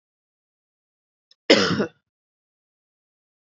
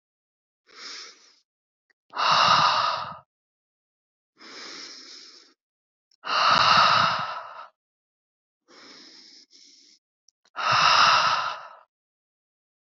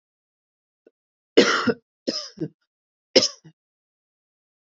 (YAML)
cough_length: 3.5 s
cough_amplitude: 28488
cough_signal_mean_std_ratio: 0.22
exhalation_length: 12.9 s
exhalation_amplitude: 16395
exhalation_signal_mean_std_ratio: 0.41
three_cough_length: 4.7 s
three_cough_amplitude: 31133
three_cough_signal_mean_std_ratio: 0.25
survey_phase: beta (2021-08-13 to 2022-03-07)
age: 18-44
gender: Female
wearing_mask: 'No'
symptom_none: true
smoker_status: Never smoked
respiratory_condition_asthma: false
respiratory_condition_other: false
recruitment_source: REACT
submission_delay: 2 days
covid_test_result: Negative
covid_test_method: RT-qPCR
influenza_a_test_result: Negative
influenza_b_test_result: Negative